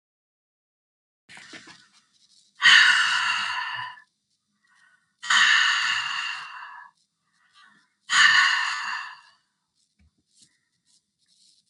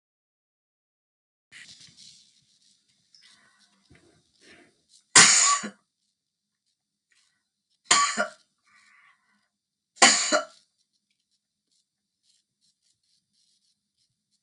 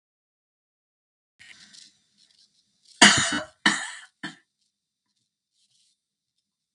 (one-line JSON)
{"exhalation_length": "11.7 s", "exhalation_amplitude": 23622, "exhalation_signal_mean_std_ratio": 0.4, "three_cough_length": "14.4 s", "three_cough_amplitude": 32322, "three_cough_signal_mean_std_ratio": 0.21, "cough_length": "6.7 s", "cough_amplitude": 32766, "cough_signal_mean_std_ratio": 0.2, "survey_phase": "beta (2021-08-13 to 2022-03-07)", "age": "65+", "gender": "Female", "wearing_mask": "No", "symptom_none": true, "symptom_onset": "6 days", "smoker_status": "Ex-smoker", "respiratory_condition_asthma": true, "respiratory_condition_other": false, "recruitment_source": "REACT", "submission_delay": "0 days", "covid_test_result": "Negative", "covid_test_method": "RT-qPCR", "influenza_a_test_result": "Negative", "influenza_b_test_result": "Negative"}